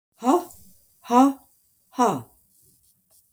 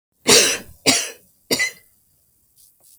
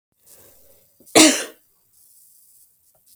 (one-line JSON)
{"exhalation_length": "3.3 s", "exhalation_amplitude": 22100, "exhalation_signal_mean_std_ratio": 0.35, "three_cough_length": "3.0 s", "three_cough_amplitude": 32768, "three_cough_signal_mean_std_ratio": 0.37, "cough_length": "3.2 s", "cough_amplitude": 32768, "cough_signal_mean_std_ratio": 0.23, "survey_phase": "beta (2021-08-13 to 2022-03-07)", "age": "65+", "gender": "Female", "wearing_mask": "No", "symptom_none": true, "smoker_status": "Never smoked", "respiratory_condition_asthma": false, "respiratory_condition_other": false, "recruitment_source": "REACT", "submission_delay": "1 day", "covid_test_result": "Negative", "covid_test_method": "RT-qPCR", "influenza_a_test_result": "Negative", "influenza_b_test_result": "Negative"}